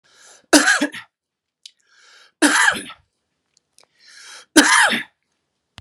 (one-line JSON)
{"three_cough_length": "5.8 s", "three_cough_amplitude": 32768, "three_cough_signal_mean_std_ratio": 0.35, "survey_phase": "beta (2021-08-13 to 2022-03-07)", "age": "45-64", "gender": "Male", "wearing_mask": "No", "symptom_none": true, "smoker_status": "Ex-smoker", "respiratory_condition_asthma": false, "respiratory_condition_other": false, "recruitment_source": "REACT", "submission_delay": "1 day", "covid_test_result": "Negative", "covid_test_method": "RT-qPCR"}